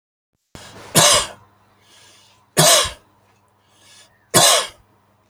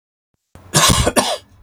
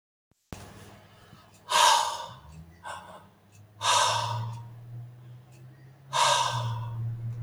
{
  "three_cough_length": "5.3 s",
  "three_cough_amplitude": 32768,
  "three_cough_signal_mean_std_ratio": 0.35,
  "cough_length": "1.6 s",
  "cough_amplitude": 32768,
  "cough_signal_mean_std_ratio": 0.49,
  "exhalation_length": "7.4 s",
  "exhalation_amplitude": 12946,
  "exhalation_signal_mean_std_ratio": 0.52,
  "survey_phase": "alpha (2021-03-01 to 2021-08-12)",
  "age": "45-64",
  "gender": "Male",
  "wearing_mask": "No",
  "symptom_none": true,
  "smoker_status": "Never smoked",
  "respiratory_condition_asthma": true,
  "respiratory_condition_other": false,
  "recruitment_source": "REACT",
  "submission_delay": "33 days",
  "covid_test_result": "Negative",
  "covid_test_method": "RT-qPCR"
}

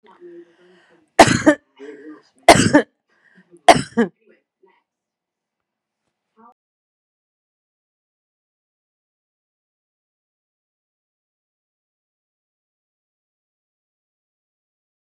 {
  "three_cough_length": "15.1 s",
  "three_cough_amplitude": 32768,
  "three_cough_signal_mean_std_ratio": 0.17,
  "survey_phase": "beta (2021-08-13 to 2022-03-07)",
  "age": "45-64",
  "gender": "Female",
  "wearing_mask": "No",
  "symptom_none": true,
  "smoker_status": "Never smoked",
  "respiratory_condition_asthma": false,
  "respiratory_condition_other": false,
  "recruitment_source": "REACT",
  "submission_delay": "1 day",
  "covid_test_result": "Negative",
  "covid_test_method": "RT-qPCR",
  "influenza_a_test_result": "Negative",
  "influenza_b_test_result": "Negative"
}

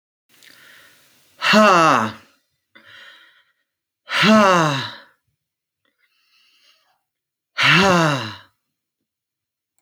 {
  "exhalation_length": "9.8 s",
  "exhalation_amplitude": 29106,
  "exhalation_signal_mean_std_ratio": 0.37,
  "survey_phase": "alpha (2021-03-01 to 2021-08-12)",
  "age": "45-64",
  "gender": "Male",
  "wearing_mask": "No",
  "symptom_shortness_of_breath": true,
  "symptom_abdominal_pain": true,
  "symptom_fatigue": true,
  "symptom_onset": "12 days",
  "smoker_status": "Never smoked",
  "respiratory_condition_asthma": false,
  "respiratory_condition_other": false,
  "recruitment_source": "REACT",
  "submission_delay": "2 days",
  "covid_test_result": "Negative",
  "covid_test_method": "RT-qPCR"
}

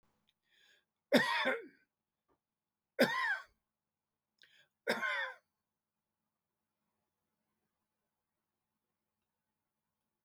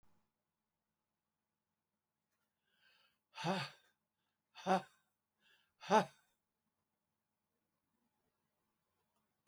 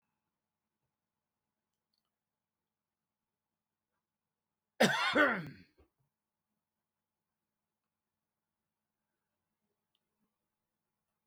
{
  "three_cough_length": "10.2 s",
  "three_cough_amplitude": 7016,
  "three_cough_signal_mean_std_ratio": 0.26,
  "exhalation_length": "9.5 s",
  "exhalation_amplitude": 4158,
  "exhalation_signal_mean_std_ratio": 0.18,
  "cough_length": "11.3 s",
  "cough_amplitude": 7285,
  "cough_signal_mean_std_ratio": 0.17,
  "survey_phase": "beta (2021-08-13 to 2022-03-07)",
  "age": "65+",
  "gender": "Male",
  "wearing_mask": "No",
  "symptom_none": true,
  "smoker_status": "Prefer not to say",
  "respiratory_condition_asthma": false,
  "respiratory_condition_other": false,
  "recruitment_source": "REACT",
  "submission_delay": "2 days",
  "covid_test_result": "Negative",
  "covid_test_method": "RT-qPCR",
  "influenza_a_test_result": "Negative",
  "influenza_b_test_result": "Negative"
}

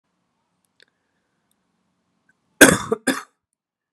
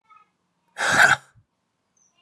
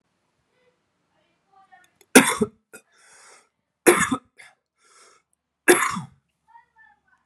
{
  "cough_length": "3.9 s",
  "cough_amplitude": 32768,
  "cough_signal_mean_std_ratio": 0.19,
  "exhalation_length": "2.2 s",
  "exhalation_amplitude": 24619,
  "exhalation_signal_mean_std_ratio": 0.32,
  "three_cough_length": "7.3 s",
  "three_cough_amplitude": 32768,
  "three_cough_signal_mean_std_ratio": 0.23,
  "survey_phase": "alpha (2021-03-01 to 2021-08-12)",
  "age": "45-64",
  "gender": "Male",
  "wearing_mask": "No",
  "symptom_cough_any": true,
  "symptom_shortness_of_breath": true,
  "symptom_fatigue": true,
  "symptom_headache": true,
  "symptom_change_to_sense_of_smell_or_taste": true,
  "symptom_loss_of_taste": true,
  "symptom_onset": "4 days",
  "smoker_status": "Never smoked",
  "respiratory_condition_asthma": true,
  "respiratory_condition_other": false,
  "recruitment_source": "Test and Trace",
  "submission_delay": "2 days",
  "covid_test_result": "Positive",
  "covid_test_method": "RT-qPCR",
  "covid_ct_value": 18.8,
  "covid_ct_gene": "ORF1ab gene",
  "covid_ct_mean": 19.1,
  "covid_viral_load": "530000 copies/ml",
  "covid_viral_load_category": "Low viral load (10K-1M copies/ml)"
}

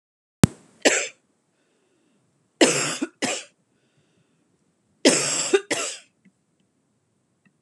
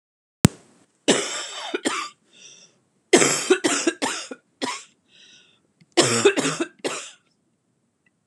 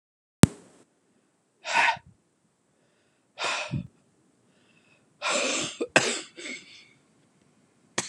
{
  "three_cough_length": "7.6 s",
  "three_cough_amplitude": 32767,
  "three_cough_signal_mean_std_ratio": 0.31,
  "cough_length": "8.3 s",
  "cough_amplitude": 32767,
  "cough_signal_mean_std_ratio": 0.39,
  "exhalation_length": "8.1 s",
  "exhalation_amplitude": 32767,
  "exhalation_signal_mean_std_ratio": 0.28,
  "survey_phase": "alpha (2021-03-01 to 2021-08-12)",
  "age": "45-64",
  "gender": "Female",
  "wearing_mask": "No",
  "symptom_cough_any": true,
  "symptom_shortness_of_breath": true,
  "symptom_fatigue": true,
  "symptom_onset": "7 days",
  "smoker_status": "Never smoked",
  "respiratory_condition_asthma": false,
  "respiratory_condition_other": false,
  "recruitment_source": "Test and Trace",
  "submission_delay": "2 days",
  "covid_test_result": "Positive",
  "covid_test_method": "RT-qPCR",
  "covid_ct_value": 16.1,
  "covid_ct_gene": "ORF1ab gene",
  "covid_ct_mean": 17.1,
  "covid_viral_load": "2400000 copies/ml",
  "covid_viral_load_category": "High viral load (>1M copies/ml)"
}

